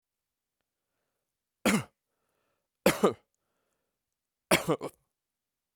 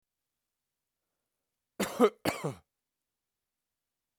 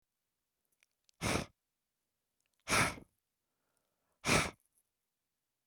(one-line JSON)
{"three_cough_length": "5.8 s", "three_cough_amplitude": 15002, "three_cough_signal_mean_std_ratio": 0.24, "cough_length": "4.2 s", "cough_amplitude": 9739, "cough_signal_mean_std_ratio": 0.22, "exhalation_length": "5.7 s", "exhalation_amplitude": 5044, "exhalation_signal_mean_std_ratio": 0.27, "survey_phase": "beta (2021-08-13 to 2022-03-07)", "age": "45-64", "gender": "Male", "wearing_mask": "No", "symptom_none": true, "smoker_status": "Current smoker (1 to 10 cigarettes per day)", "respiratory_condition_asthma": false, "respiratory_condition_other": false, "recruitment_source": "REACT", "submission_delay": "1 day", "covid_test_result": "Negative", "covid_test_method": "RT-qPCR", "influenza_a_test_result": "Negative", "influenza_b_test_result": "Negative"}